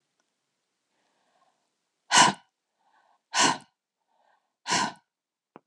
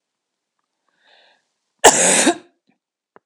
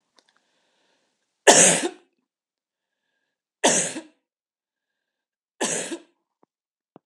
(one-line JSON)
{"exhalation_length": "5.7 s", "exhalation_amplitude": 22128, "exhalation_signal_mean_std_ratio": 0.25, "cough_length": "3.3 s", "cough_amplitude": 32768, "cough_signal_mean_std_ratio": 0.29, "three_cough_length": "7.1 s", "three_cough_amplitude": 32767, "three_cough_signal_mean_std_ratio": 0.25, "survey_phase": "beta (2021-08-13 to 2022-03-07)", "age": "45-64", "gender": "Female", "wearing_mask": "No", "symptom_none": true, "smoker_status": "Never smoked", "respiratory_condition_asthma": false, "respiratory_condition_other": false, "recruitment_source": "REACT", "submission_delay": "3 days", "covid_test_result": "Negative", "covid_test_method": "RT-qPCR"}